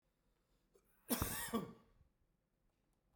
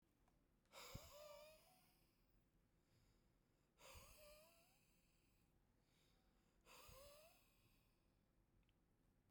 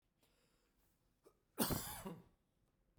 {"cough_length": "3.2 s", "cough_amplitude": 2404, "cough_signal_mean_std_ratio": 0.34, "exhalation_length": "9.3 s", "exhalation_amplitude": 214, "exhalation_signal_mean_std_ratio": 0.6, "three_cough_length": "3.0 s", "three_cough_amplitude": 2637, "three_cough_signal_mean_std_ratio": 0.31, "survey_phase": "beta (2021-08-13 to 2022-03-07)", "age": "45-64", "gender": "Male", "wearing_mask": "No", "symptom_fatigue": true, "smoker_status": "Never smoked", "respiratory_condition_asthma": true, "respiratory_condition_other": false, "recruitment_source": "REACT", "submission_delay": "-2 days", "covid_test_result": "Negative", "covid_test_method": "RT-qPCR"}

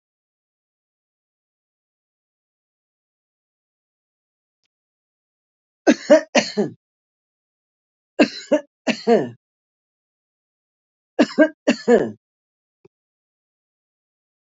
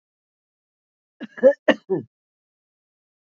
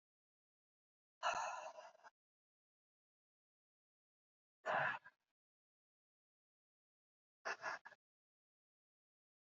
{"three_cough_length": "14.5 s", "three_cough_amplitude": 27942, "three_cough_signal_mean_std_ratio": 0.22, "cough_length": "3.3 s", "cough_amplitude": 26381, "cough_signal_mean_std_ratio": 0.21, "exhalation_length": "9.5 s", "exhalation_amplitude": 1411, "exhalation_signal_mean_std_ratio": 0.26, "survey_phase": "beta (2021-08-13 to 2022-03-07)", "age": "65+", "gender": "Female", "wearing_mask": "No", "symptom_none": true, "smoker_status": "Current smoker (1 to 10 cigarettes per day)", "respiratory_condition_asthma": false, "respiratory_condition_other": true, "recruitment_source": "REACT", "submission_delay": "2 days", "covid_test_result": "Negative", "covid_test_method": "RT-qPCR", "influenza_a_test_result": "Negative", "influenza_b_test_result": "Negative"}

